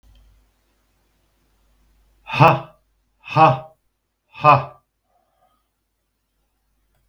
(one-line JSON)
{"exhalation_length": "7.1 s", "exhalation_amplitude": 32767, "exhalation_signal_mean_std_ratio": 0.24, "survey_phase": "beta (2021-08-13 to 2022-03-07)", "age": "65+", "gender": "Male", "wearing_mask": "No", "symptom_none": true, "smoker_status": "Ex-smoker", "respiratory_condition_asthma": false, "respiratory_condition_other": false, "recruitment_source": "REACT", "submission_delay": "2 days", "covid_test_result": "Negative", "covid_test_method": "RT-qPCR", "influenza_a_test_result": "Unknown/Void", "influenza_b_test_result": "Unknown/Void"}